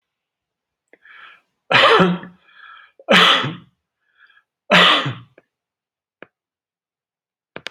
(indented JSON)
{
  "three_cough_length": "7.7 s",
  "three_cough_amplitude": 32768,
  "three_cough_signal_mean_std_ratio": 0.33,
  "survey_phase": "beta (2021-08-13 to 2022-03-07)",
  "age": "65+",
  "gender": "Male",
  "wearing_mask": "No",
  "symptom_none": true,
  "smoker_status": "Never smoked",
  "respiratory_condition_asthma": false,
  "respiratory_condition_other": false,
  "recruitment_source": "REACT",
  "submission_delay": "2 days",
  "covid_test_result": "Negative",
  "covid_test_method": "RT-qPCR",
  "influenza_a_test_result": "Negative",
  "influenza_b_test_result": "Negative"
}